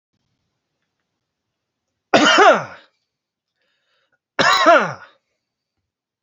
{"cough_length": "6.2 s", "cough_amplitude": 32767, "cough_signal_mean_std_ratio": 0.32, "survey_phase": "beta (2021-08-13 to 2022-03-07)", "age": "18-44", "gender": "Male", "wearing_mask": "No", "symptom_none": true, "symptom_onset": "4 days", "smoker_status": "Never smoked", "respiratory_condition_asthma": false, "respiratory_condition_other": false, "recruitment_source": "REACT", "submission_delay": "2 days", "covid_test_result": "Negative", "covid_test_method": "RT-qPCR", "influenza_a_test_result": "Negative", "influenza_b_test_result": "Negative"}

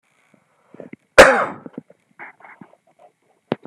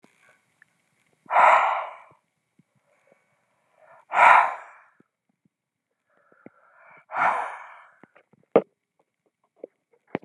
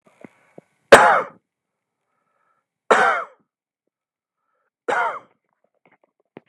{"cough_length": "3.7 s", "cough_amplitude": 32768, "cough_signal_mean_std_ratio": 0.22, "exhalation_length": "10.2 s", "exhalation_amplitude": 27228, "exhalation_signal_mean_std_ratio": 0.27, "three_cough_length": "6.5 s", "three_cough_amplitude": 32768, "three_cough_signal_mean_std_ratio": 0.25, "survey_phase": "beta (2021-08-13 to 2022-03-07)", "age": "65+", "gender": "Male", "wearing_mask": "No", "symptom_none": true, "smoker_status": "Ex-smoker", "respiratory_condition_asthma": false, "respiratory_condition_other": false, "recruitment_source": "REACT", "submission_delay": "0 days", "covid_test_result": "Negative", "covid_test_method": "RT-qPCR"}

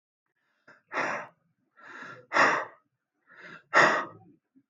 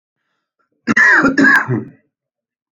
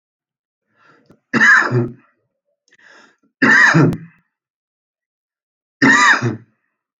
{"exhalation_length": "4.7 s", "exhalation_amplitude": 17672, "exhalation_signal_mean_std_ratio": 0.35, "cough_length": "2.7 s", "cough_amplitude": 28418, "cough_signal_mean_std_ratio": 0.48, "three_cough_length": "7.0 s", "three_cough_amplitude": 29858, "three_cough_signal_mean_std_ratio": 0.4, "survey_phase": "beta (2021-08-13 to 2022-03-07)", "age": "45-64", "gender": "Male", "wearing_mask": "No", "symptom_none": true, "smoker_status": "Current smoker (11 or more cigarettes per day)", "respiratory_condition_asthma": false, "respiratory_condition_other": false, "recruitment_source": "REACT", "submission_delay": "1 day", "covid_test_result": "Negative", "covid_test_method": "RT-qPCR"}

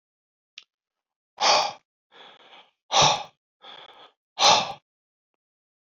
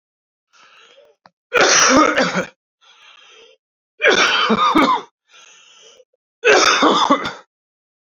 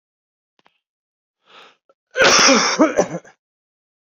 {"exhalation_length": "5.8 s", "exhalation_amplitude": 20185, "exhalation_signal_mean_std_ratio": 0.31, "three_cough_length": "8.1 s", "three_cough_amplitude": 30297, "three_cough_signal_mean_std_ratio": 0.49, "cough_length": "4.2 s", "cough_amplitude": 32767, "cough_signal_mean_std_ratio": 0.36, "survey_phase": "beta (2021-08-13 to 2022-03-07)", "age": "45-64", "gender": "Male", "wearing_mask": "No", "symptom_cough_any": true, "symptom_runny_or_blocked_nose": true, "symptom_fever_high_temperature": true, "symptom_headache": true, "smoker_status": "Current smoker (1 to 10 cigarettes per day)", "respiratory_condition_asthma": false, "respiratory_condition_other": false, "recruitment_source": "Test and Trace", "submission_delay": "2 days", "covid_test_result": "Positive", "covid_test_method": "RT-qPCR"}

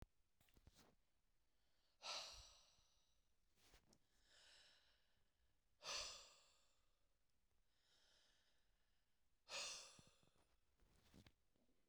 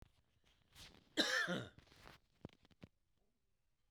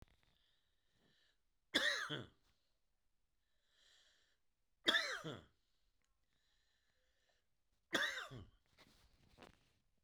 {"exhalation_length": "11.9 s", "exhalation_amplitude": 433, "exhalation_signal_mean_std_ratio": 0.38, "cough_length": "3.9 s", "cough_amplitude": 2991, "cough_signal_mean_std_ratio": 0.32, "three_cough_length": "10.0 s", "three_cough_amplitude": 3598, "three_cough_signal_mean_std_ratio": 0.28, "survey_phase": "beta (2021-08-13 to 2022-03-07)", "age": "45-64", "gender": "Male", "wearing_mask": "No", "symptom_runny_or_blocked_nose": true, "symptom_abdominal_pain": true, "symptom_fatigue": true, "symptom_headache": true, "symptom_onset": "7 days", "smoker_status": "Ex-smoker", "respiratory_condition_asthma": false, "respiratory_condition_other": false, "recruitment_source": "Test and Trace", "submission_delay": "2 days", "covid_test_result": "Positive", "covid_test_method": "RT-qPCR", "covid_ct_value": 25.2, "covid_ct_gene": "ORF1ab gene"}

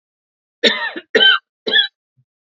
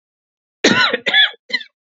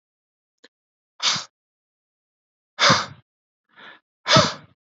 {"three_cough_length": "2.6 s", "three_cough_amplitude": 31237, "three_cough_signal_mean_std_ratio": 0.4, "cough_length": "2.0 s", "cough_amplitude": 30740, "cough_signal_mean_std_ratio": 0.45, "exhalation_length": "4.9 s", "exhalation_amplitude": 27642, "exhalation_signal_mean_std_ratio": 0.28, "survey_phase": "alpha (2021-03-01 to 2021-08-12)", "age": "18-44", "gender": "Male", "wearing_mask": "No", "symptom_headache": true, "smoker_status": "Never smoked", "respiratory_condition_asthma": false, "respiratory_condition_other": false, "recruitment_source": "REACT", "submission_delay": "1 day", "covid_test_result": "Negative", "covid_test_method": "RT-qPCR"}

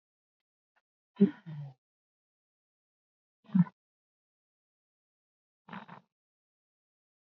{"exhalation_length": "7.3 s", "exhalation_amplitude": 8473, "exhalation_signal_mean_std_ratio": 0.16, "survey_phase": "beta (2021-08-13 to 2022-03-07)", "age": "45-64", "gender": "Female", "wearing_mask": "No", "symptom_none": true, "smoker_status": "Never smoked", "respiratory_condition_asthma": false, "respiratory_condition_other": false, "recruitment_source": "REACT", "submission_delay": "1 day", "covid_test_result": "Negative", "covid_test_method": "RT-qPCR"}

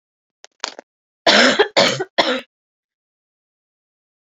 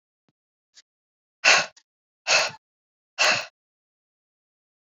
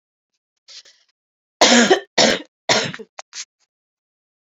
{"cough_length": "4.3 s", "cough_amplitude": 30661, "cough_signal_mean_std_ratio": 0.34, "exhalation_length": "4.9 s", "exhalation_amplitude": 23049, "exhalation_signal_mean_std_ratio": 0.28, "three_cough_length": "4.5 s", "three_cough_amplitude": 30261, "three_cough_signal_mean_std_ratio": 0.33, "survey_phase": "beta (2021-08-13 to 2022-03-07)", "age": "18-44", "gender": "Female", "wearing_mask": "No", "symptom_cough_any": true, "symptom_runny_or_blocked_nose": true, "symptom_shortness_of_breath": true, "symptom_fatigue": true, "symptom_change_to_sense_of_smell_or_taste": true, "symptom_loss_of_taste": true, "symptom_other": true, "symptom_onset": "3 days", "smoker_status": "Never smoked", "respiratory_condition_asthma": false, "respiratory_condition_other": false, "recruitment_source": "Test and Trace", "submission_delay": "2 days", "covid_test_result": "Positive", "covid_test_method": "RT-qPCR", "covid_ct_value": 12.6, "covid_ct_gene": "ORF1ab gene", "covid_ct_mean": 13.3, "covid_viral_load": "45000000 copies/ml", "covid_viral_load_category": "High viral load (>1M copies/ml)"}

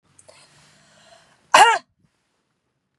{"cough_length": "3.0 s", "cough_amplitude": 32191, "cough_signal_mean_std_ratio": 0.23, "survey_phase": "beta (2021-08-13 to 2022-03-07)", "age": "45-64", "gender": "Female", "wearing_mask": "No", "symptom_none": true, "smoker_status": "Never smoked", "respiratory_condition_asthma": false, "respiratory_condition_other": false, "recruitment_source": "REACT", "submission_delay": "5 days", "covid_test_result": "Negative", "covid_test_method": "RT-qPCR", "influenza_a_test_result": "Negative", "influenza_b_test_result": "Negative"}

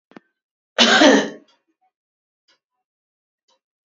{"cough_length": "3.8 s", "cough_amplitude": 32767, "cough_signal_mean_std_ratio": 0.29, "survey_phase": "beta (2021-08-13 to 2022-03-07)", "age": "18-44", "gender": "Female", "wearing_mask": "No", "symptom_none": true, "smoker_status": "Never smoked", "respiratory_condition_asthma": true, "respiratory_condition_other": false, "recruitment_source": "REACT", "submission_delay": "7 days", "covid_test_result": "Negative", "covid_test_method": "RT-qPCR", "influenza_a_test_result": "Negative", "influenza_b_test_result": "Negative"}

